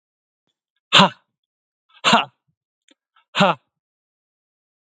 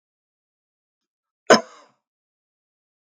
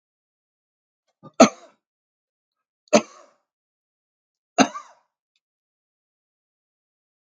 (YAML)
exhalation_length: 4.9 s
exhalation_amplitude: 32767
exhalation_signal_mean_std_ratio: 0.24
cough_length: 3.2 s
cough_amplitude: 32768
cough_signal_mean_std_ratio: 0.13
three_cough_length: 7.3 s
three_cough_amplitude: 32768
three_cough_signal_mean_std_ratio: 0.14
survey_phase: beta (2021-08-13 to 2022-03-07)
age: 45-64
gender: Male
wearing_mask: 'No'
symptom_none: true
smoker_status: Never smoked
respiratory_condition_asthma: false
respiratory_condition_other: false
recruitment_source: REACT
submission_delay: 1 day
covid_test_result: Negative
covid_test_method: RT-qPCR
influenza_a_test_result: Negative
influenza_b_test_result: Negative